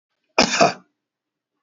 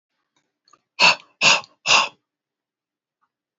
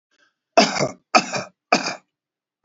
{"cough_length": "1.6 s", "cough_amplitude": 27208, "cough_signal_mean_std_ratio": 0.32, "exhalation_length": "3.6 s", "exhalation_amplitude": 27125, "exhalation_signal_mean_std_ratio": 0.3, "three_cough_length": "2.6 s", "three_cough_amplitude": 29494, "three_cough_signal_mean_std_ratio": 0.35, "survey_phase": "beta (2021-08-13 to 2022-03-07)", "age": "45-64", "gender": "Male", "wearing_mask": "No", "symptom_none": true, "smoker_status": "Current smoker (1 to 10 cigarettes per day)", "respiratory_condition_asthma": false, "respiratory_condition_other": false, "recruitment_source": "REACT", "submission_delay": "1 day", "covid_test_result": "Negative", "covid_test_method": "RT-qPCR"}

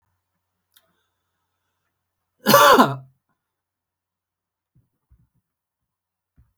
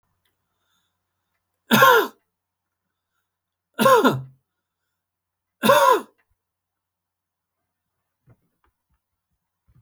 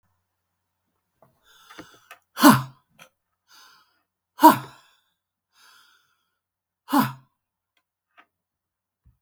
{"cough_length": "6.6 s", "cough_amplitude": 32767, "cough_signal_mean_std_ratio": 0.21, "three_cough_length": "9.8 s", "three_cough_amplitude": 32768, "three_cough_signal_mean_std_ratio": 0.27, "exhalation_length": "9.2 s", "exhalation_amplitude": 32768, "exhalation_signal_mean_std_ratio": 0.18, "survey_phase": "beta (2021-08-13 to 2022-03-07)", "age": "45-64", "gender": "Male", "wearing_mask": "No", "symptom_none": true, "smoker_status": "Ex-smoker", "respiratory_condition_asthma": false, "respiratory_condition_other": false, "recruitment_source": "REACT", "submission_delay": "3 days", "covid_test_result": "Negative", "covid_test_method": "RT-qPCR", "influenza_a_test_result": "Negative", "influenza_b_test_result": "Negative"}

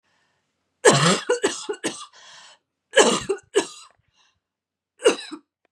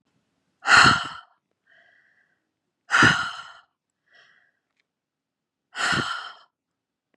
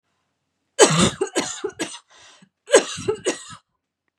{"three_cough_length": "5.7 s", "three_cough_amplitude": 32725, "three_cough_signal_mean_std_ratio": 0.36, "exhalation_length": "7.2 s", "exhalation_amplitude": 25749, "exhalation_signal_mean_std_ratio": 0.3, "cough_length": "4.2 s", "cough_amplitude": 32247, "cough_signal_mean_std_ratio": 0.36, "survey_phase": "beta (2021-08-13 to 2022-03-07)", "age": "45-64", "gender": "Female", "wearing_mask": "No", "symptom_none": true, "smoker_status": "Ex-smoker", "respiratory_condition_asthma": false, "respiratory_condition_other": false, "recruitment_source": "Test and Trace", "submission_delay": "0 days", "covid_test_result": "Negative", "covid_test_method": "LFT"}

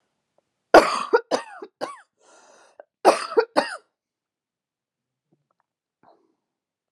{"three_cough_length": "6.9 s", "three_cough_amplitude": 32768, "three_cough_signal_mean_std_ratio": 0.23, "survey_phase": "alpha (2021-03-01 to 2021-08-12)", "age": "18-44", "gender": "Female", "wearing_mask": "No", "symptom_cough_any": true, "symptom_onset": "4 days", "smoker_status": "Never smoked", "respiratory_condition_asthma": false, "respiratory_condition_other": false, "recruitment_source": "Test and Trace", "submission_delay": "2 days", "covid_test_result": "Positive", "covid_test_method": "RT-qPCR", "covid_ct_value": 19.1, "covid_ct_gene": "N gene", "covid_ct_mean": 19.2, "covid_viral_load": "490000 copies/ml", "covid_viral_load_category": "Low viral load (10K-1M copies/ml)"}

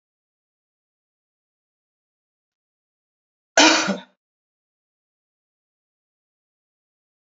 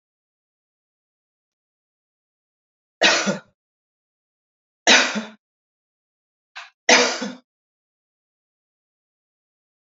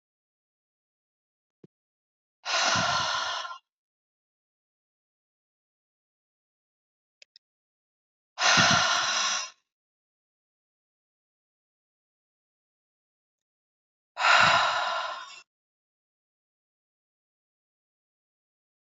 {"cough_length": "7.3 s", "cough_amplitude": 32528, "cough_signal_mean_std_ratio": 0.16, "three_cough_length": "10.0 s", "three_cough_amplitude": 31846, "three_cough_signal_mean_std_ratio": 0.23, "exhalation_length": "18.9 s", "exhalation_amplitude": 15846, "exhalation_signal_mean_std_ratio": 0.3, "survey_phase": "beta (2021-08-13 to 2022-03-07)", "age": "65+", "gender": "Female", "wearing_mask": "No", "symptom_runny_or_blocked_nose": true, "symptom_onset": "6 days", "smoker_status": "Ex-smoker", "respiratory_condition_asthma": false, "respiratory_condition_other": false, "recruitment_source": "REACT", "submission_delay": "2 days", "covid_test_result": "Negative", "covid_test_method": "RT-qPCR", "influenza_a_test_result": "Negative", "influenza_b_test_result": "Negative"}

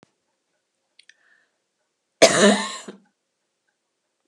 {"three_cough_length": "4.3 s", "three_cough_amplitude": 32768, "three_cough_signal_mean_std_ratio": 0.24, "survey_phase": "beta (2021-08-13 to 2022-03-07)", "age": "65+", "gender": "Female", "wearing_mask": "No", "symptom_none": true, "smoker_status": "Never smoked", "respiratory_condition_asthma": false, "respiratory_condition_other": false, "recruitment_source": "REACT", "submission_delay": "1 day", "covid_test_result": "Negative", "covid_test_method": "RT-qPCR"}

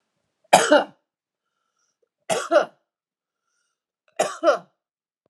{"three_cough_length": "5.3 s", "three_cough_amplitude": 32767, "three_cough_signal_mean_std_ratio": 0.29, "survey_phase": "alpha (2021-03-01 to 2021-08-12)", "age": "45-64", "gender": "Female", "wearing_mask": "No", "symptom_none": true, "smoker_status": "Never smoked", "respiratory_condition_asthma": false, "respiratory_condition_other": false, "recruitment_source": "Test and Trace", "submission_delay": "2 days", "covid_test_result": "Positive", "covid_test_method": "RT-qPCR", "covid_ct_value": 22.8, "covid_ct_gene": "ORF1ab gene"}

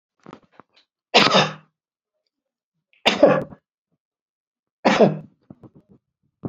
{"three_cough_length": "6.5 s", "three_cough_amplitude": 32768, "three_cough_signal_mean_std_ratio": 0.3, "survey_phase": "beta (2021-08-13 to 2022-03-07)", "age": "65+", "gender": "Male", "wearing_mask": "No", "symptom_none": true, "smoker_status": "Never smoked", "respiratory_condition_asthma": false, "respiratory_condition_other": false, "recruitment_source": "REACT", "submission_delay": "3 days", "covid_test_result": "Negative", "covid_test_method": "RT-qPCR"}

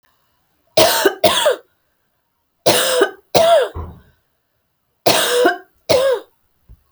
{"three_cough_length": "6.9 s", "three_cough_amplitude": 32768, "three_cough_signal_mean_std_ratio": 0.5, "survey_phase": "beta (2021-08-13 to 2022-03-07)", "age": "18-44", "gender": "Female", "wearing_mask": "No", "symptom_none": true, "smoker_status": "Ex-smoker", "respiratory_condition_asthma": false, "respiratory_condition_other": false, "recruitment_source": "REACT", "submission_delay": "1 day", "covid_test_result": "Negative", "covid_test_method": "RT-qPCR"}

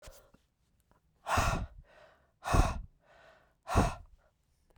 {"exhalation_length": "4.8 s", "exhalation_amplitude": 7532, "exhalation_signal_mean_std_ratio": 0.36, "survey_phase": "beta (2021-08-13 to 2022-03-07)", "age": "45-64", "gender": "Female", "wearing_mask": "No", "symptom_cough_any": true, "symptom_new_continuous_cough": true, "symptom_shortness_of_breath": true, "symptom_change_to_sense_of_smell_or_taste": true, "smoker_status": "Never smoked", "respiratory_condition_asthma": true, "respiratory_condition_other": false, "recruitment_source": "Test and Trace", "submission_delay": "2 days", "covid_test_result": "Positive", "covid_test_method": "LFT"}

